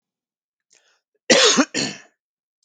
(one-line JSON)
{"cough_length": "2.6 s", "cough_amplitude": 29676, "cough_signal_mean_std_ratio": 0.34, "survey_phase": "beta (2021-08-13 to 2022-03-07)", "age": "45-64", "gender": "Male", "wearing_mask": "No", "symptom_none": true, "smoker_status": "Never smoked", "respiratory_condition_asthma": false, "respiratory_condition_other": false, "recruitment_source": "REACT", "submission_delay": "1 day", "covid_test_result": "Negative", "covid_test_method": "RT-qPCR"}